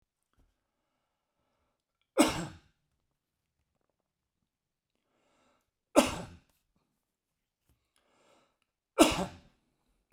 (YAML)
three_cough_length: 10.1 s
three_cough_amplitude: 16416
three_cough_signal_mean_std_ratio: 0.18
survey_phase: beta (2021-08-13 to 2022-03-07)
age: 45-64
gender: Male
wearing_mask: 'No'
symptom_none: true
smoker_status: Never smoked
respiratory_condition_asthma: false
respiratory_condition_other: false
recruitment_source: REACT
submission_delay: 1 day
covid_test_result: Negative
covid_test_method: RT-qPCR